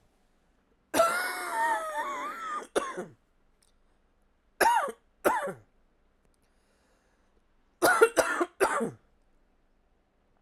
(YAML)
three_cough_length: 10.4 s
three_cough_amplitude: 16513
three_cough_signal_mean_std_ratio: 0.42
survey_phase: alpha (2021-03-01 to 2021-08-12)
age: 45-64
gender: Female
wearing_mask: 'No'
symptom_cough_any: true
symptom_fatigue: true
symptom_headache: true
symptom_onset: 3 days
smoker_status: Never smoked
respiratory_condition_asthma: false
respiratory_condition_other: false
recruitment_source: Test and Trace
submission_delay: 1 day
covid_test_result: Positive
covid_test_method: RT-qPCR
covid_ct_value: 13.8
covid_ct_gene: ORF1ab gene
covid_ct_mean: 14.6
covid_viral_load: 17000000 copies/ml
covid_viral_load_category: High viral load (>1M copies/ml)